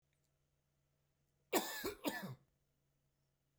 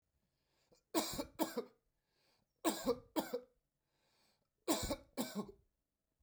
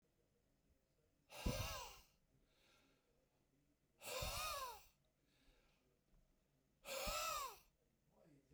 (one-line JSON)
{"cough_length": "3.6 s", "cough_amplitude": 3245, "cough_signal_mean_std_ratio": 0.31, "three_cough_length": "6.2 s", "three_cough_amplitude": 2984, "three_cough_signal_mean_std_ratio": 0.37, "exhalation_length": "8.5 s", "exhalation_amplitude": 1106, "exhalation_signal_mean_std_ratio": 0.43, "survey_phase": "beta (2021-08-13 to 2022-03-07)", "age": "45-64", "gender": "Male", "wearing_mask": "No", "symptom_none": true, "smoker_status": "Never smoked", "respiratory_condition_asthma": false, "respiratory_condition_other": false, "recruitment_source": "REACT", "submission_delay": "1 day", "covid_test_result": "Negative", "covid_test_method": "RT-qPCR"}